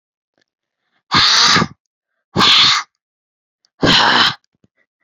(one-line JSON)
{"exhalation_length": "5.0 s", "exhalation_amplitude": 32767, "exhalation_signal_mean_std_ratio": 0.47, "survey_phase": "beta (2021-08-13 to 2022-03-07)", "age": "18-44", "gender": "Female", "wearing_mask": "No", "symptom_none": true, "smoker_status": "Never smoked", "respiratory_condition_asthma": true, "respiratory_condition_other": false, "recruitment_source": "Test and Trace", "submission_delay": "-1 day", "covid_test_result": "Negative", "covid_test_method": "LFT"}